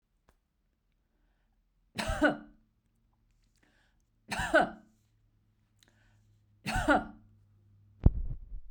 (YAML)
three_cough_length: 8.7 s
three_cough_amplitude: 13313
three_cough_signal_mean_std_ratio: 0.29
survey_phase: beta (2021-08-13 to 2022-03-07)
age: 45-64
gender: Female
wearing_mask: 'No'
symptom_none: true
smoker_status: Never smoked
respiratory_condition_asthma: false
respiratory_condition_other: false
recruitment_source: REACT
submission_delay: 1 day
covid_test_result: Negative
covid_test_method: RT-qPCR
influenza_a_test_result: Negative
influenza_b_test_result: Negative